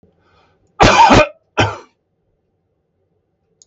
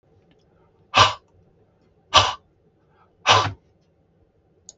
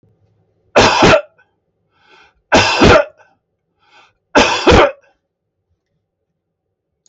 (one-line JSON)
{"cough_length": "3.7 s", "cough_amplitude": 32768, "cough_signal_mean_std_ratio": 0.34, "exhalation_length": "4.8 s", "exhalation_amplitude": 32766, "exhalation_signal_mean_std_ratio": 0.27, "three_cough_length": "7.1 s", "three_cough_amplitude": 32768, "three_cough_signal_mean_std_ratio": 0.38, "survey_phase": "beta (2021-08-13 to 2022-03-07)", "age": "65+", "gender": "Male", "wearing_mask": "No", "symptom_none": true, "smoker_status": "Never smoked", "respiratory_condition_asthma": false, "respiratory_condition_other": false, "recruitment_source": "REACT", "submission_delay": "1 day", "covid_test_result": "Negative", "covid_test_method": "RT-qPCR", "influenza_a_test_result": "Negative", "influenza_b_test_result": "Negative"}